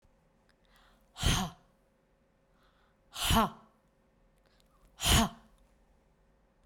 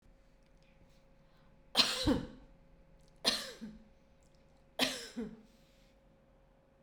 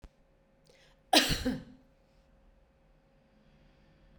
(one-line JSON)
{"exhalation_length": "6.7 s", "exhalation_amplitude": 9380, "exhalation_signal_mean_std_ratio": 0.3, "three_cough_length": "6.8 s", "three_cough_amplitude": 8609, "three_cough_signal_mean_std_ratio": 0.34, "cough_length": "4.2 s", "cough_amplitude": 13012, "cough_signal_mean_std_ratio": 0.25, "survey_phase": "beta (2021-08-13 to 2022-03-07)", "age": "45-64", "gender": "Female", "wearing_mask": "No", "symptom_none": true, "smoker_status": "Ex-smoker", "respiratory_condition_asthma": false, "respiratory_condition_other": false, "recruitment_source": "REACT", "submission_delay": "3 days", "covid_test_result": "Negative", "covid_test_method": "RT-qPCR"}